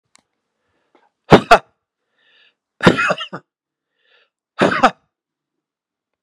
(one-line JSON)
{"exhalation_length": "6.2 s", "exhalation_amplitude": 32768, "exhalation_signal_mean_std_ratio": 0.24, "survey_phase": "beta (2021-08-13 to 2022-03-07)", "age": "45-64", "gender": "Male", "wearing_mask": "No", "symptom_cough_any": true, "symptom_runny_or_blocked_nose": true, "symptom_fatigue": true, "symptom_headache": true, "smoker_status": "Never smoked", "respiratory_condition_asthma": false, "respiratory_condition_other": false, "recruitment_source": "Test and Trace", "submission_delay": "2 days", "covid_test_result": "Positive", "covid_test_method": "RT-qPCR", "covid_ct_value": 22.6, "covid_ct_gene": "ORF1ab gene", "covid_ct_mean": 23.0, "covid_viral_load": "28000 copies/ml", "covid_viral_load_category": "Low viral load (10K-1M copies/ml)"}